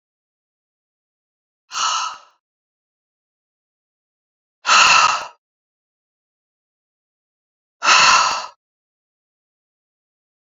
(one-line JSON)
{"exhalation_length": "10.5 s", "exhalation_amplitude": 31105, "exhalation_signal_mean_std_ratio": 0.29, "survey_phase": "beta (2021-08-13 to 2022-03-07)", "age": "45-64", "gender": "Female", "wearing_mask": "No", "symptom_cough_any": true, "symptom_new_continuous_cough": true, "symptom_fatigue": true, "symptom_change_to_sense_of_smell_or_taste": true, "symptom_loss_of_taste": true, "smoker_status": "Ex-smoker", "respiratory_condition_asthma": false, "respiratory_condition_other": false, "recruitment_source": "Test and Trace", "submission_delay": "2 days", "covid_test_result": "Positive", "covid_test_method": "RT-qPCR", "covid_ct_value": 22.2, "covid_ct_gene": "ORF1ab gene"}